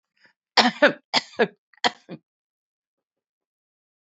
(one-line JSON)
{"three_cough_length": "4.0 s", "three_cough_amplitude": 28101, "three_cough_signal_mean_std_ratio": 0.24, "survey_phase": "beta (2021-08-13 to 2022-03-07)", "age": "65+", "gender": "Female", "wearing_mask": "No", "symptom_none": true, "smoker_status": "Never smoked", "respiratory_condition_asthma": false, "respiratory_condition_other": false, "recruitment_source": "REACT", "submission_delay": "2 days", "covid_test_result": "Negative", "covid_test_method": "RT-qPCR"}